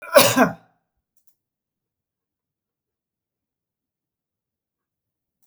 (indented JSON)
{
  "cough_length": "5.5 s",
  "cough_amplitude": 32768,
  "cough_signal_mean_std_ratio": 0.19,
  "survey_phase": "beta (2021-08-13 to 2022-03-07)",
  "age": "45-64",
  "gender": "Male",
  "wearing_mask": "No",
  "symptom_none": true,
  "smoker_status": "Never smoked",
  "respiratory_condition_asthma": false,
  "respiratory_condition_other": false,
  "recruitment_source": "REACT",
  "submission_delay": "2 days",
  "covid_test_result": "Negative",
  "covid_test_method": "RT-qPCR",
  "influenza_a_test_result": "Negative",
  "influenza_b_test_result": "Negative"
}